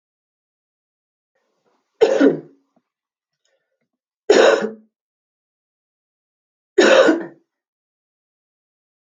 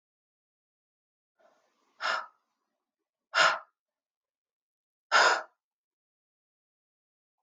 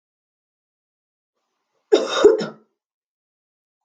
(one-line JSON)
{"three_cough_length": "9.1 s", "three_cough_amplitude": 30474, "three_cough_signal_mean_std_ratio": 0.28, "exhalation_length": "7.4 s", "exhalation_amplitude": 11367, "exhalation_signal_mean_std_ratio": 0.23, "cough_length": "3.8 s", "cough_amplitude": 27450, "cough_signal_mean_std_ratio": 0.25, "survey_phase": "beta (2021-08-13 to 2022-03-07)", "age": "18-44", "gender": "Female", "wearing_mask": "No", "symptom_cough_any": true, "symptom_runny_or_blocked_nose": true, "symptom_sore_throat": true, "symptom_abdominal_pain": true, "symptom_headache": true, "symptom_change_to_sense_of_smell_or_taste": true, "symptom_loss_of_taste": true, "symptom_other": true, "symptom_onset": "6 days", "smoker_status": "Never smoked", "respiratory_condition_asthma": false, "respiratory_condition_other": false, "recruitment_source": "Test and Trace", "submission_delay": "2 days", "covid_test_result": "Positive", "covid_test_method": "RT-qPCR", "covid_ct_value": 13.8, "covid_ct_gene": "ORF1ab gene", "covid_ct_mean": 14.0, "covid_viral_load": "25000000 copies/ml", "covid_viral_load_category": "High viral load (>1M copies/ml)"}